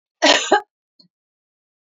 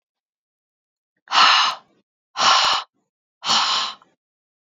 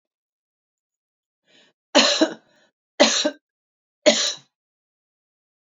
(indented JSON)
{
  "cough_length": "1.9 s",
  "cough_amplitude": 30356,
  "cough_signal_mean_std_ratio": 0.31,
  "exhalation_length": "4.8 s",
  "exhalation_amplitude": 27307,
  "exhalation_signal_mean_std_ratio": 0.42,
  "three_cough_length": "5.7 s",
  "three_cough_amplitude": 31799,
  "three_cough_signal_mean_std_ratio": 0.29,
  "survey_phase": "beta (2021-08-13 to 2022-03-07)",
  "age": "45-64",
  "gender": "Female",
  "wearing_mask": "No",
  "symptom_none": true,
  "smoker_status": "Ex-smoker",
  "respiratory_condition_asthma": false,
  "respiratory_condition_other": false,
  "recruitment_source": "REACT",
  "submission_delay": "2 days",
  "covid_test_result": "Negative",
  "covid_test_method": "RT-qPCR",
  "influenza_a_test_result": "Unknown/Void",
  "influenza_b_test_result": "Unknown/Void"
}